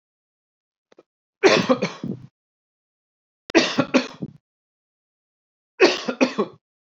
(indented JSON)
{
  "three_cough_length": "7.0 s",
  "three_cough_amplitude": 28882,
  "three_cough_signal_mean_std_ratio": 0.31,
  "survey_phase": "beta (2021-08-13 to 2022-03-07)",
  "age": "18-44",
  "gender": "Male",
  "wearing_mask": "No",
  "symptom_cough_any": true,
  "smoker_status": "Never smoked",
  "respiratory_condition_asthma": false,
  "respiratory_condition_other": false,
  "recruitment_source": "REACT",
  "submission_delay": "1 day",
  "covid_test_result": "Negative",
  "covid_test_method": "RT-qPCR"
}